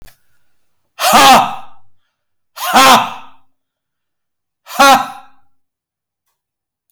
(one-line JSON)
{"exhalation_length": "6.9 s", "exhalation_amplitude": 32768, "exhalation_signal_mean_std_ratio": 0.38, "survey_phase": "alpha (2021-03-01 to 2021-08-12)", "age": "65+", "gender": "Male", "wearing_mask": "No", "symptom_none": true, "smoker_status": "Never smoked", "respiratory_condition_asthma": false, "respiratory_condition_other": false, "recruitment_source": "REACT", "submission_delay": "1 day", "covid_test_result": "Negative", "covid_test_method": "RT-qPCR"}